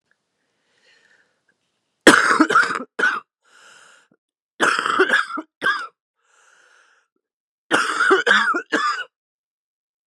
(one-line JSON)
{"three_cough_length": "10.1 s", "three_cough_amplitude": 32768, "three_cough_signal_mean_std_ratio": 0.41, "survey_phase": "beta (2021-08-13 to 2022-03-07)", "age": "45-64", "gender": "Female", "wearing_mask": "No", "symptom_cough_any": true, "symptom_new_continuous_cough": true, "symptom_shortness_of_breath": true, "symptom_fatigue": true, "symptom_headache": true, "symptom_onset": "5 days", "smoker_status": "Prefer not to say", "respiratory_condition_asthma": false, "respiratory_condition_other": false, "recruitment_source": "Test and Trace", "submission_delay": "1 day", "covid_test_result": "Negative", "covid_test_method": "RT-qPCR"}